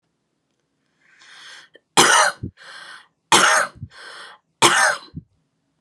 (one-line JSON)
{"three_cough_length": "5.8 s", "three_cough_amplitude": 32767, "three_cough_signal_mean_std_ratio": 0.37, "survey_phase": "beta (2021-08-13 to 2022-03-07)", "age": "18-44", "gender": "Female", "wearing_mask": "No", "symptom_none": true, "smoker_status": "Never smoked", "respiratory_condition_asthma": false, "respiratory_condition_other": false, "recruitment_source": "REACT", "submission_delay": "2 days", "covid_test_result": "Negative", "covid_test_method": "RT-qPCR"}